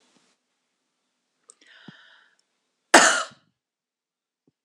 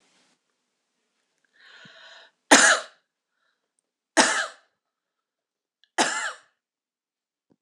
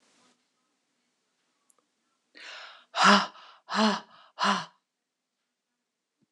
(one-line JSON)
{"cough_length": "4.6 s", "cough_amplitude": 26028, "cough_signal_mean_std_ratio": 0.18, "three_cough_length": "7.6 s", "three_cough_amplitude": 26028, "three_cough_signal_mean_std_ratio": 0.24, "exhalation_length": "6.3 s", "exhalation_amplitude": 16163, "exhalation_signal_mean_std_ratio": 0.28, "survey_phase": "beta (2021-08-13 to 2022-03-07)", "age": "45-64", "gender": "Female", "wearing_mask": "No", "symptom_none": true, "symptom_onset": "4 days", "smoker_status": "Never smoked", "respiratory_condition_asthma": false, "respiratory_condition_other": false, "recruitment_source": "REACT", "submission_delay": "3 days", "covid_test_result": "Negative", "covid_test_method": "RT-qPCR", "influenza_a_test_result": "Negative", "influenza_b_test_result": "Negative"}